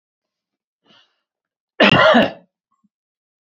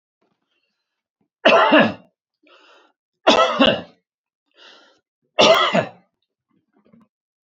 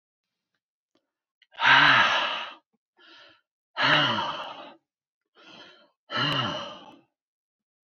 {
  "cough_length": "3.5 s",
  "cough_amplitude": 27996,
  "cough_signal_mean_std_ratio": 0.3,
  "three_cough_length": "7.5 s",
  "three_cough_amplitude": 30182,
  "three_cough_signal_mean_std_ratio": 0.35,
  "exhalation_length": "7.9 s",
  "exhalation_amplitude": 17507,
  "exhalation_signal_mean_std_ratio": 0.39,
  "survey_phase": "beta (2021-08-13 to 2022-03-07)",
  "age": "65+",
  "gender": "Male",
  "wearing_mask": "No",
  "symptom_none": true,
  "smoker_status": "Ex-smoker",
  "respiratory_condition_asthma": false,
  "respiratory_condition_other": false,
  "recruitment_source": "REACT",
  "submission_delay": "2 days",
  "covid_test_result": "Negative",
  "covid_test_method": "RT-qPCR",
  "influenza_a_test_result": "Negative",
  "influenza_b_test_result": "Negative"
}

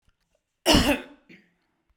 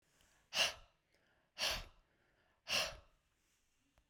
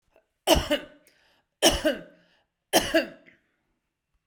{
  "cough_length": "2.0 s",
  "cough_amplitude": 20855,
  "cough_signal_mean_std_ratio": 0.33,
  "exhalation_length": "4.1 s",
  "exhalation_amplitude": 2941,
  "exhalation_signal_mean_std_ratio": 0.33,
  "three_cough_length": "4.3 s",
  "three_cough_amplitude": 22155,
  "three_cough_signal_mean_std_ratio": 0.34,
  "survey_phase": "beta (2021-08-13 to 2022-03-07)",
  "age": "45-64",
  "gender": "Female",
  "wearing_mask": "No",
  "symptom_cough_any": true,
  "symptom_runny_or_blocked_nose": true,
  "symptom_fatigue": true,
  "symptom_onset": "9 days",
  "smoker_status": "Never smoked",
  "respiratory_condition_asthma": false,
  "respiratory_condition_other": false,
  "recruitment_source": "REACT",
  "submission_delay": "0 days",
  "covid_test_result": "Negative",
  "covid_test_method": "RT-qPCR",
  "influenza_a_test_result": "Negative",
  "influenza_b_test_result": "Negative"
}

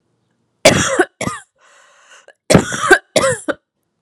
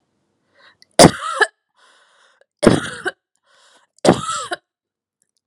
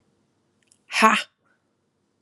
{
  "cough_length": "4.0 s",
  "cough_amplitude": 32768,
  "cough_signal_mean_std_ratio": 0.4,
  "three_cough_length": "5.5 s",
  "three_cough_amplitude": 32768,
  "three_cough_signal_mean_std_ratio": 0.27,
  "exhalation_length": "2.2 s",
  "exhalation_amplitude": 32245,
  "exhalation_signal_mean_std_ratio": 0.26,
  "survey_phase": "alpha (2021-03-01 to 2021-08-12)",
  "age": "18-44",
  "gender": "Female",
  "wearing_mask": "No",
  "symptom_cough_any": true,
  "symptom_fatigue": true,
  "symptom_headache": true,
  "symptom_onset": "12 days",
  "smoker_status": "Never smoked",
  "respiratory_condition_asthma": false,
  "respiratory_condition_other": false,
  "recruitment_source": "REACT",
  "submission_delay": "1 day",
  "covid_test_result": "Negative",
  "covid_test_method": "RT-qPCR"
}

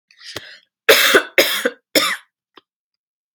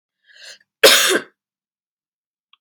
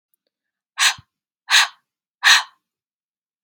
{
  "three_cough_length": "3.3 s",
  "three_cough_amplitude": 32768,
  "three_cough_signal_mean_std_ratio": 0.39,
  "cough_length": "2.6 s",
  "cough_amplitude": 32767,
  "cough_signal_mean_std_ratio": 0.29,
  "exhalation_length": "3.4 s",
  "exhalation_amplitude": 32445,
  "exhalation_signal_mean_std_ratio": 0.29,
  "survey_phase": "beta (2021-08-13 to 2022-03-07)",
  "age": "18-44",
  "gender": "Female",
  "wearing_mask": "No",
  "symptom_cough_any": true,
  "symptom_runny_or_blocked_nose": true,
  "symptom_sore_throat": true,
  "symptom_fever_high_temperature": true,
  "symptom_other": true,
  "symptom_onset": "3 days",
  "smoker_status": "Never smoked",
  "respiratory_condition_asthma": true,
  "respiratory_condition_other": false,
  "recruitment_source": "Test and Trace",
  "submission_delay": "1 day",
  "covid_test_result": "Positive",
  "covid_test_method": "RT-qPCR",
  "covid_ct_value": 22.7,
  "covid_ct_gene": "ORF1ab gene"
}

